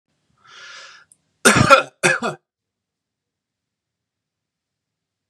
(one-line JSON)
{"cough_length": "5.3 s", "cough_amplitude": 32768, "cough_signal_mean_std_ratio": 0.25, "survey_phase": "beta (2021-08-13 to 2022-03-07)", "age": "18-44", "gender": "Male", "wearing_mask": "No", "symptom_none": true, "smoker_status": "Never smoked", "respiratory_condition_asthma": false, "respiratory_condition_other": false, "recruitment_source": "REACT", "submission_delay": "1 day", "covid_test_result": "Negative", "covid_test_method": "RT-qPCR", "influenza_a_test_result": "Negative", "influenza_b_test_result": "Negative"}